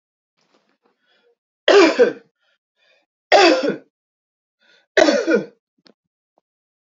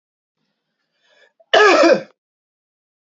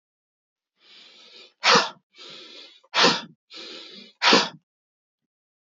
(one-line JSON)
{"three_cough_length": "7.0 s", "three_cough_amplitude": 31873, "three_cough_signal_mean_std_ratio": 0.33, "cough_length": "3.1 s", "cough_amplitude": 28716, "cough_signal_mean_std_ratio": 0.33, "exhalation_length": "5.7 s", "exhalation_amplitude": 23621, "exhalation_signal_mean_std_ratio": 0.31, "survey_phase": "alpha (2021-03-01 to 2021-08-12)", "age": "18-44", "gender": "Male", "wearing_mask": "No", "symptom_none": true, "smoker_status": "Never smoked", "respiratory_condition_asthma": false, "respiratory_condition_other": false, "recruitment_source": "REACT", "submission_delay": "1 day", "covid_test_result": "Negative", "covid_test_method": "RT-qPCR"}